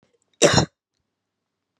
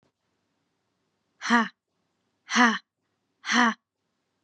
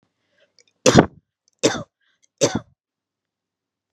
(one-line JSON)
{"cough_length": "1.8 s", "cough_amplitude": 31332, "cough_signal_mean_std_ratio": 0.27, "exhalation_length": "4.4 s", "exhalation_amplitude": 19217, "exhalation_signal_mean_std_ratio": 0.31, "three_cough_length": "3.9 s", "three_cough_amplitude": 32768, "three_cough_signal_mean_std_ratio": 0.24, "survey_phase": "beta (2021-08-13 to 2022-03-07)", "age": "18-44", "gender": "Female", "wearing_mask": "No", "symptom_cough_any": true, "symptom_runny_or_blocked_nose": true, "symptom_sore_throat": true, "symptom_diarrhoea": true, "symptom_fatigue": true, "symptom_fever_high_temperature": true, "symptom_headache": true, "symptom_onset": "2 days", "smoker_status": "Never smoked", "respiratory_condition_asthma": true, "respiratory_condition_other": false, "recruitment_source": "Test and Trace", "submission_delay": "1 day", "covid_test_result": "Positive", "covid_test_method": "RT-qPCR", "covid_ct_value": 20.5, "covid_ct_gene": "ORF1ab gene", "covid_ct_mean": 20.9, "covid_viral_load": "140000 copies/ml", "covid_viral_load_category": "Low viral load (10K-1M copies/ml)"}